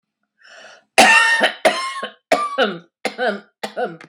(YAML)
cough_length: 4.1 s
cough_amplitude: 32768
cough_signal_mean_std_ratio: 0.5
survey_phase: beta (2021-08-13 to 2022-03-07)
age: 45-64
gender: Female
wearing_mask: 'No'
symptom_none: true
smoker_status: Ex-smoker
respiratory_condition_asthma: false
respiratory_condition_other: false
recruitment_source: REACT
submission_delay: 1 day
covid_test_result: Negative
covid_test_method: RT-qPCR